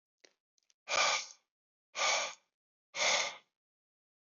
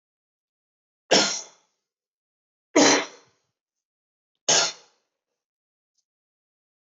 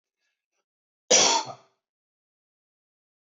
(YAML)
exhalation_length: 4.4 s
exhalation_amplitude: 4412
exhalation_signal_mean_std_ratio: 0.4
three_cough_length: 6.8 s
three_cough_amplitude: 18224
three_cough_signal_mean_std_ratio: 0.26
cough_length: 3.3 s
cough_amplitude: 16737
cough_signal_mean_std_ratio: 0.25
survey_phase: beta (2021-08-13 to 2022-03-07)
age: 45-64
gender: Male
wearing_mask: 'No'
symptom_cough_any: true
symptom_runny_or_blocked_nose: true
symptom_shortness_of_breath: true
symptom_fatigue: true
symptom_headache: true
symptom_onset: 3 days
smoker_status: Never smoked
respiratory_condition_asthma: false
respiratory_condition_other: false
recruitment_source: Test and Trace
submission_delay: 1 day
covid_test_result: Positive
covid_test_method: ePCR